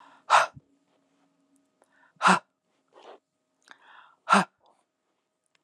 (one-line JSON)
{"exhalation_length": "5.6 s", "exhalation_amplitude": 19752, "exhalation_signal_mean_std_ratio": 0.23, "survey_phase": "alpha (2021-03-01 to 2021-08-12)", "age": "45-64", "gender": "Female", "wearing_mask": "No", "symptom_none": true, "smoker_status": "Ex-smoker", "respiratory_condition_asthma": true, "respiratory_condition_other": false, "recruitment_source": "Test and Trace", "submission_delay": "2 days", "covid_test_result": "Positive", "covid_test_method": "LAMP"}